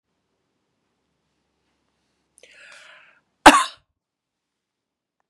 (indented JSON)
{
  "cough_length": "5.3 s",
  "cough_amplitude": 32768,
  "cough_signal_mean_std_ratio": 0.13,
  "survey_phase": "beta (2021-08-13 to 2022-03-07)",
  "age": "65+",
  "gender": "Female",
  "wearing_mask": "No",
  "symptom_runny_or_blocked_nose": true,
  "symptom_onset": "12 days",
  "smoker_status": "Ex-smoker",
  "respiratory_condition_asthma": false,
  "respiratory_condition_other": false,
  "recruitment_source": "REACT",
  "submission_delay": "0 days",
  "covid_test_result": "Negative",
  "covid_test_method": "RT-qPCR",
  "influenza_a_test_result": "Negative",
  "influenza_b_test_result": "Negative"
}